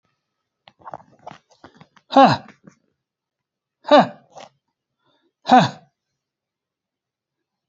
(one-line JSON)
{"exhalation_length": "7.7 s", "exhalation_amplitude": 29174, "exhalation_signal_mean_std_ratio": 0.22, "survey_phase": "beta (2021-08-13 to 2022-03-07)", "age": "45-64", "gender": "Male", "wearing_mask": "No", "symptom_none": true, "smoker_status": "Never smoked", "respiratory_condition_asthma": false, "respiratory_condition_other": false, "recruitment_source": "REACT", "submission_delay": "3 days", "covid_test_result": "Negative", "covid_test_method": "RT-qPCR", "influenza_a_test_result": "Unknown/Void", "influenza_b_test_result": "Unknown/Void"}